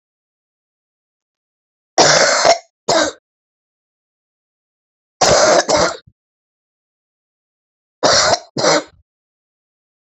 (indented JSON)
{
  "three_cough_length": "10.2 s",
  "three_cough_amplitude": 32767,
  "three_cough_signal_mean_std_ratio": 0.37,
  "survey_phase": "beta (2021-08-13 to 2022-03-07)",
  "age": "65+",
  "gender": "Female",
  "wearing_mask": "No",
  "symptom_cough_any": true,
  "symptom_runny_or_blocked_nose": true,
  "symptom_sore_throat": true,
  "symptom_fatigue": true,
  "symptom_headache": true,
  "symptom_change_to_sense_of_smell_or_taste": true,
  "symptom_loss_of_taste": true,
  "smoker_status": "Ex-smoker",
  "respiratory_condition_asthma": false,
  "respiratory_condition_other": false,
  "recruitment_source": "Test and Trace",
  "submission_delay": "1 day",
  "covid_test_result": "Positive",
  "covid_test_method": "RT-qPCR",
  "covid_ct_value": 12.1,
  "covid_ct_gene": "N gene",
  "covid_ct_mean": 12.4,
  "covid_viral_load": "89000000 copies/ml",
  "covid_viral_load_category": "High viral load (>1M copies/ml)"
}